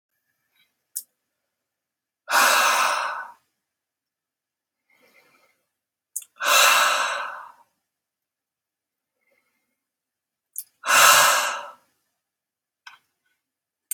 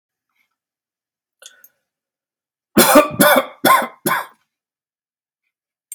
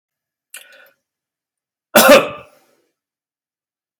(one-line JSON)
{"exhalation_length": "13.9 s", "exhalation_amplitude": 29525, "exhalation_signal_mean_std_ratio": 0.33, "three_cough_length": "5.9 s", "three_cough_amplitude": 32768, "three_cough_signal_mean_std_ratio": 0.31, "cough_length": "4.0 s", "cough_amplitude": 32768, "cough_signal_mean_std_ratio": 0.24, "survey_phase": "beta (2021-08-13 to 2022-03-07)", "age": "45-64", "gender": "Male", "wearing_mask": "No", "symptom_none": true, "smoker_status": "Never smoked", "respiratory_condition_asthma": false, "respiratory_condition_other": false, "recruitment_source": "REACT", "submission_delay": "2 days", "covid_test_result": "Negative", "covid_test_method": "RT-qPCR", "influenza_a_test_result": "Negative", "influenza_b_test_result": "Negative"}